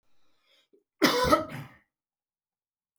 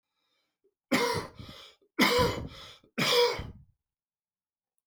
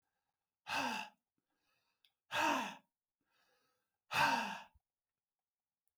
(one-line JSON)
{"cough_length": "3.0 s", "cough_amplitude": 17472, "cough_signal_mean_std_ratio": 0.31, "three_cough_length": "4.9 s", "three_cough_amplitude": 10944, "three_cough_signal_mean_std_ratio": 0.42, "exhalation_length": "6.0 s", "exhalation_amplitude": 3296, "exhalation_signal_mean_std_ratio": 0.36, "survey_phase": "beta (2021-08-13 to 2022-03-07)", "age": "45-64", "gender": "Male", "wearing_mask": "No", "symptom_none": true, "smoker_status": "Ex-smoker", "respiratory_condition_asthma": true, "respiratory_condition_other": false, "recruitment_source": "REACT", "submission_delay": "1 day", "covid_test_result": "Negative", "covid_test_method": "RT-qPCR"}